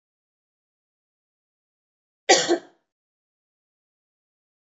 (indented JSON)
{
  "cough_length": "4.8 s",
  "cough_amplitude": 24206,
  "cough_signal_mean_std_ratio": 0.17,
  "survey_phase": "beta (2021-08-13 to 2022-03-07)",
  "age": "18-44",
  "gender": "Female",
  "wearing_mask": "Yes",
  "symptom_runny_or_blocked_nose": true,
  "symptom_fever_high_temperature": true,
  "symptom_headache": true,
  "symptom_change_to_sense_of_smell_or_taste": true,
  "symptom_other": true,
  "symptom_onset": "3 days",
  "smoker_status": "Never smoked",
  "respiratory_condition_asthma": false,
  "respiratory_condition_other": false,
  "recruitment_source": "Test and Trace",
  "submission_delay": "2 days",
  "covid_test_result": "Positive",
  "covid_test_method": "RT-qPCR",
  "covid_ct_value": 16.2,
  "covid_ct_gene": "ORF1ab gene",
  "covid_ct_mean": 16.6,
  "covid_viral_load": "3500000 copies/ml",
  "covid_viral_load_category": "High viral load (>1M copies/ml)"
}